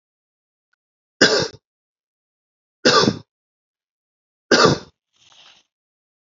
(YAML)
three_cough_length: 6.4 s
three_cough_amplitude: 32768
three_cough_signal_mean_std_ratio: 0.27
survey_phase: beta (2021-08-13 to 2022-03-07)
age: 45-64
gender: Male
wearing_mask: 'No'
symptom_fatigue: true
symptom_headache: true
symptom_change_to_sense_of_smell_or_taste: true
symptom_loss_of_taste: true
symptom_onset: 4 days
smoker_status: Never smoked
respiratory_condition_asthma: false
respiratory_condition_other: false
recruitment_source: Test and Trace
submission_delay: 2 days
covid_test_result: Positive
covid_test_method: RT-qPCR
covid_ct_value: 17.2
covid_ct_gene: ORF1ab gene
covid_ct_mean: 17.7
covid_viral_load: 1600000 copies/ml
covid_viral_load_category: High viral load (>1M copies/ml)